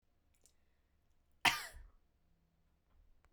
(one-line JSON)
{"cough_length": "3.3 s", "cough_amplitude": 6644, "cough_signal_mean_std_ratio": 0.19, "survey_phase": "beta (2021-08-13 to 2022-03-07)", "age": "45-64", "gender": "Female", "wearing_mask": "No", "symptom_none": true, "smoker_status": "Never smoked", "respiratory_condition_asthma": false, "respiratory_condition_other": false, "recruitment_source": "Test and Trace", "submission_delay": "0 days", "covid_test_result": "Negative", "covid_test_method": "LFT"}